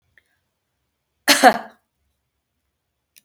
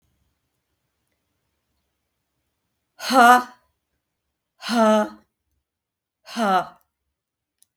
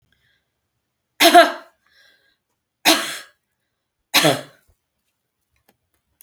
cough_length: 3.2 s
cough_amplitude: 32768
cough_signal_mean_std_ratio: 0.21
exhalation_length: 7.8 s
exhalation_amplitude: 29318
exhalation_signal_mean_std_ratio: 0.28
three_cough_length: 6.2 s
three_cough_amplitude: 32768
three_cough_signal_mean_std_ratio: 0.26
survey_phase: beta (2021-08-13 to 2022-03-07)
age: 65+
gender: Female
wearing_mask: 'No'
symptom_none: true
smoker_status: Never smoked
respiratory_condition_asthma: false
respiratory_condition_other: false
recruitment_source: REACT
submission_delay: 1 day
covid_test_result: Negative
covid_test_method: RT-qPCR
influenza_a_test_result: Negative
influenza_b_test_result: Negative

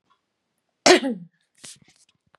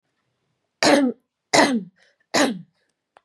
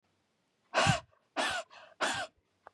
cough_length: 2.4 s
cough_amplitude: 31119
cough_signal_mean_std_ratio: 0.24
three_cough_length: 3.2 s
three_cough_amplitude: 28204
three_cough_signal_mean_std_ratio: 0.4
exhalation_length: 2.7 s
exhalation_amplitude: 7039
exhalation_signal_mean_std_ratio: 0.42
survey_phase: beta (2021-08-13 to 2022-03-07)
age: 18-44
gender: Female
wearing_mask: 'No'
symptom_runny_or_blocked_nose: true
symptom_onset: 13 days
smoker_status: Never smoked
respiratory_condition_asthma: false
respiratory_condition_other: false
recruitment_source: REACT
submission_delay: 1 day
covid_test_result: Negative
covid_test_method: RT-qPCR
influenza_a_test_result: Unknown/Void
influenza_b_test_result: Unknown/Void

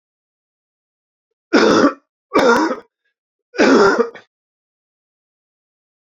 three_cough_length: 6.1 s
three_cough_amplitude: 28341
three_cough_signal_mean_std_ratio: 0.38
survey_phase: beta (2021-08-13 to 2022-03-07)
age: 45-64
gender: Male
wearing_mask: 'No'
symptom_new_continuous_cough: true
symptom_abdominal_pain: true
symptom_fatigue: true
symptom_headache: true
symptom_other: true
smoker_status: Never smoked
respiratory_condition_asthma: false
respiratory_condition_other: false
recruitment_source: Test and Trace
submission_delay: 2 days
covid_test_result: Positive
covid_test_method: RT-qPCR
covid_ct_value: 17.7
covid_ct_gene: ORF1ab gene
covid_ct_mean: 18.5
covid_viral_load: 860000 copies/ml
covid_viral_load_category: Low viral load (10K-1M copies/ml)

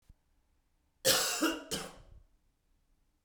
cough_length: 3.2 s
cough_amplitude: 8624
cough_signal_mean_std_ratio: 0.37
survey_phase: beta (2021-08-13 to 2022-03-07)
age: 45-64
gender: Male
wearing_mask: 'No'
symptom_none: true
smoker_status: Ex-smoker
respiratory_condition_asthma: false
respiratory_condition_other: false
recruitment_source: REACT
submission_delay: 0 days
covid_test_result: Negative
covid_test_method: RT-qPCR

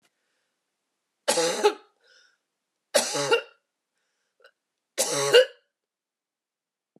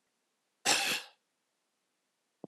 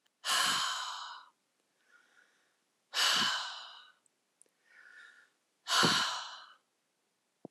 three_cough_length: 7.0 s
three_cough_amplitude: 23355
three_cough_signal_mean_std_ratio: 0.31
cough_length: 2.5 s
cough_amplitude: 8347
cough_signal_mean_std_ratio: 0.3
exhalation_length: 7.5 s
exhalation_amplitude: 6466
exhalation_signal_mean_std_ratio: 0.43
survey_phase: alpha (2021-03-01 to 2021-08-12)
age: 45-64
gender: Female
wearing_mask: 'No'
symptom_none: true
symptom_onset: 7 days
smoker_status: Never smoked
respiratory_condition_asthma: false
respiratory_condition_other: false
recruitment_source: REACT
submission_delay: 1 day
covid_test_result: Negative
covid_test_method: RT-qPCR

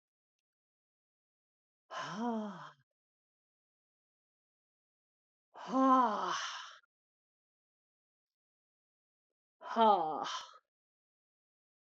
exhalation_length: 11.9 s
exhalation_amplitude: 4986
exhalation_signal_mean_std_ratio: 0.3
survey_phase: beta (2021-08-13 to 2022-03-07)
age: 45-64
gender: Female
wearing_mask: 'No'
symptom_cough_any: true
symptom_runny_or_blocked_nose: true
symptom_headache: true
smoker_status: Ex-smoker
respiratory_condition_asthma: false
respiratory_condition_other: false
recruitment_source: Test and Trace
submission_delay: 2 days
covid_test_result: Positive
covid_test_method: RT-qPCR
covid_ct_value: 17.9
covid_ct_gene: ORF1ab gene
covid_ct_mean: 18.6
covid_viral_load: 800000 copies/ml
covid_viral_load_category: Low viral load (10K-1M copies/ml)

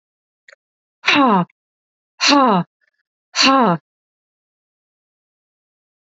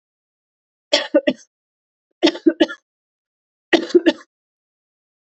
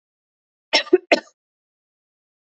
exhalation_length: 6.1 s
exhalation_amplitude: 29097
exhalation_signal_mean_std_ratio: 0.36
three_cough_length: 5.3 s
three_cough_amplitude: 32768
three_cough_signal_mean_std_ratio: 0.27
cough_length: 2.6 s
cough_amplitude: 26074
cough_signal_mean_std_ratio: 0.2
survey_phase: alpha (2021-03-01 to 2021-08-12)
age: 45-64
gender: Female
wearing_mask: 'No'
symptom_none: true
smoker_status: Ex-smoker
respiratory_condition_asthma: false
respiratory_condition_other: false
recruitment_source: REACT
submission_delay: 2 days
covid_test_result: Negative
covid_test_method: RT-qPCR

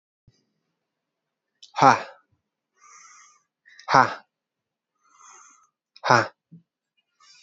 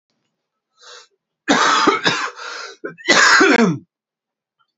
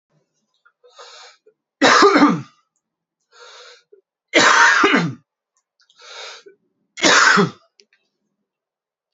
exhalation_length: 7.4 s
exhalation_amplitude: 28122
exhalation_signal_mean_std_ratio: 0.2
cough_length: 4.8 s
cough_amplitude: 32117
cough_signal_mean_std_ratio: 0.48
three_cough_length: 9.1 s
three_cough_amplitude: 32768
three_cough_signal_mean_std_ratio: 0.38
survey_phase: alpha (2021-03-01 to 2021-08-12)
age: 18-44
gender: Male
wearing_mask: 'No'
symptom_cough_any: true
symptom_fatigue: true
symptom_fever_high_temperature: true
symptom_headache: true
symptom_change_to_sense_of_smell_or_taste: true
symptom_loss_of_taste: true
symptom_onset: 3 days
smoker_status: Ex-smoker
respiratory_condition_asthma: false
respiratory_condition_other: false
recruitment_source: Test and Trace
submission_delay: 2 days
covid_test_result: Positive
covid_test_method: RT-qPCR
covid_ct_value: 17.5
covid_ct_gene: ORF1ab gene
covid_ct_mean: 18.1
covid_viral_load: 1100000 copies/ml
covid_viral_load_category: High viral load (>1M copies/ml)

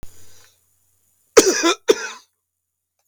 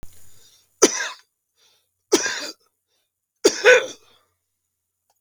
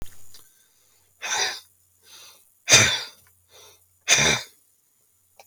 cough_length: 3.1 s
cough_amplitude: 32768
cough_signal_mean_std_ratio: 0.3
three_cough_length: 5.2 s
three_cough_amplitude: 32768
three_cough_signal_mean_std_ratio: 0.29
exhalation_length: 5.5 s
exhalation_amplitude: 31159
exhalation_signal_mean_std_ratio: 0.34
survey_phase: beta (2021-08-13 to 2022-03-07)
age: 65+
gender: Male
wearing_mask: 'No'
symptom_none: true
smoker_status: Ex-smoker
respiratory_condition_asthma: true
respiratory_condition_other: false
recruitment_source: REACT
submission_delay: 3 days
covid_test_result: Negative
covid_test_method: RT-qPCR
influenza_a_test_result: Negative
influenza_b_test_result: Negative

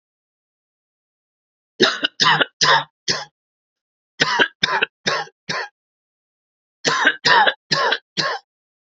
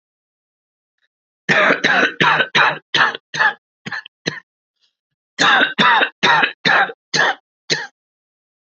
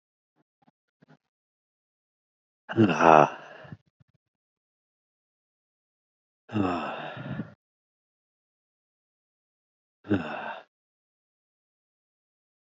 three_cough_length: 9.0 s
three_cough_amplitude: 32767
three_cough_signal_mean_std_ratio: 0.41
cough_length: 8.7 s
cough_amplitude: 32768
cough_signal_mean_std_ratio: 0.49
exhalation_length: 12.8 s
exhalation_amplitude: 26307
exhalation_signal_mean_std_ratio: 0.21
survey_phase: alpha (2021-03-01 to 2021-08-12)
age: 18-44
gender: Male
wearing_mask: 'No'
symptom_cough_any: true
symptom_fatigue: true
symptom_fever_high_temperature: true
symptom_headache: true
symptom_onset: 2 days
smoker_status: Ex-smoker
respiratory_condition_asthma: false
respiratory_condition_other: false
recruitment_source: Test and Trace
submission_delay: 2 days
covid_test_result: Positive
covid_test_method: RT-qPCR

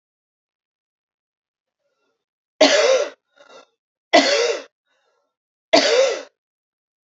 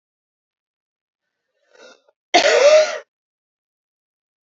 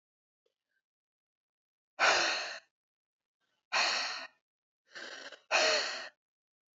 three_cough_length: 7.1 s
three_cough_amplitude: 30335
three_cough_signal_mean_std_ratio: 0.35
cough_length: 4.4 s
cough_amplitude: 29600
cough_signal_mean_std_ratio: 0.3
exhalation_length: 6.7 s
exhalation_amplitude: 7545
exhalation_signal_mean_std_ratio: 0.38
survey_phase: beta (2021-08-13 to 2022-03-07)
age: 18-44
gender: Female
wearing_mask: 'No'
symptom_runny_or_blocked_nose: true
symptom_change_to_sense_of_smell_or_taste: true
smoker_status: Never smoked
respiratory_condition_asthma: true
respiratory_condition_other: false
recruitment_source: Test and Trace
submission_delay: 2 days
covid_test_result: Positive
covid_test_method: RT-qPCR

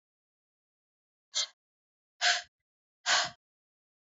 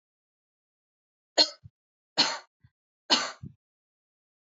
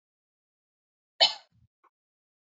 exhalation_length: 4.1 s
exhalation_amplitude: 8701
exhalation_signal_mean_std_ratio: 0.27
three_cough_length: 4.4 s
three_cough_amplitude: 15911
three_cough_signal_mean_std_ratio: 0.23
cough_length: 2.6 s
cough_amplitude: 22529
cough_signal_mean_std_ratio: 0.15
survey_phase: alpha (2021-03-01 to 2021-08-12)
age: 18-44
gender: Female
wearing_mask: 'No'
symptom_none: true
smoker_status: Never smoked
respiratory_condition_asthma: false
respiratory_condition_other: false
recruitment_source: REACT
submission_delay: 2 days
covid_test_result: Negative
covid_test_method: RT-qPCR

